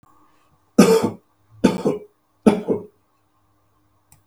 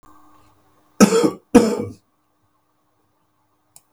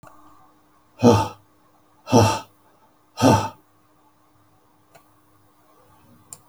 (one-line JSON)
{"three_cough_length": "4.3 s", "three_cough_amplitude": 32768, "three_cough_signal_mean_std_ratio": 0.33, "cough_length": "3.9 s", "cough_amplitude": 32768, "cough_signal_mean_std_ratio": 0.28, "exhalation_length": "6.5 s", "exhalation_amplitude": 31169, "exhalation_signal_mean_std_ratio": 0.28, "survey_phase": "beta (2021-08-13 to 2022-03-07)", "age": "65+", "gender": "Male", "wearing_mask": "No", "symptom_none": true, "smoker_status": "Ex-smoker", "respiratory_condition_asthma": false, "respiratory_condition_other": false, "recruitment_source": "REACT", "submission_delay": "1 day", "covid_test_result": "Negative", "covid_test_method": "RT-qPCR", "influenza_a_test_result": "Negative", "influenza_b_test_result": "Negative"}